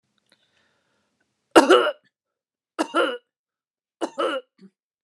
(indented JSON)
{
  "three_cough_length": "5.0 s",
  "three_cough_amplitude": 29204,
  "three_cough_signal_mean_std_ratio": 0.28,
  "survey_phase": "beta (2021-08-13 to 2022-03-07)",
  "age": "45-64",
  "gender": "Female",
  "wearing_mask": "No",
  "symptom_fatigue": true,
  "smoker_status": "Never smoked",
  "respiratory_condition_asthma": false,
  "respiratory_condition_other": false,
  "recruitment_source": "REACT",
  "submission_delay": "1 day",
  "covid_test_result": "Negative",
  "covid_test_method": "RT-qPCR"
}